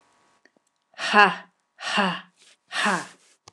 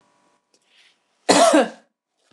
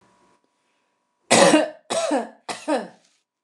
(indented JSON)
{
  "exhalation_length": "3.5 s",
  "exhalation_amplitude": 29203,
  "exhalation_signal_mean_std_ratio": 0.35,
  "cough_length": "2.3 s",
  "cough_amplitude": 29204,
  "cough_signal_mean_std_ratio": 0.34,
  "three_cough_length": "3.4 s",
  "three_cough_amplitude": 28471,
  "three_cough_signal_mean_std_ratio": 0.39,
  "survey_phase": "beta (2021-08-13 to 2022-03-07)",
  "age": "45-64",
  "gender": "Female",
  "wearing_mask": "No",
  "symptom_runny_or_blocked_nose": true,
  "smoker_status": "Ex-smoker",
  "respiratory_condition_asthma": false,
  "respiratory_condition_other": false,
  "recruitment_source": "REACT",
  "submission_delay": "1 day",
  "covid_test_result": "Negative",
  "covid_test_method": "RT-qPCR"
}